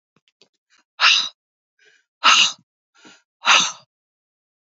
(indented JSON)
{
  "exhalation_length": "4.6 s",
  "exhalation_amplitude": 29954,
  "exhalation_signal_mean_std_ratio": 0.32,
  "survey_phase": "beta (2021-08-13 to 2022-03-07)",
  "age": "18-44",
  "gender": "Female",
  "wearing_mask": "No",
  "symptom_cough_any": true,
  "symptom_runny_or_blocked_nose": true,
  "symptom_sore_throat": true,
  "symptom_fatigue": true,
  "symptom_headache": true,
  "symptom_onset": "3 days",
  "smoker_status": "Never smoked",
  "respiratory_condition_asthma": false,
  "respiratory_condition_other": false,
  "recruitment_source": "Test and Trace",
  "submission_delay": "2 days",
  "covid_test_result": "Positive",
  "covid_test_method": "RT-qPCR",
  "covid_ct_value": 23.5,
  "covid_ct_gene": "N gene",
  "covid_ct_mean": 23.8,
  "covid_viral_load": "16000 copies/ml",
  "covid_viral_load_category": "Low viral load (10K-1M copies/ml)"
}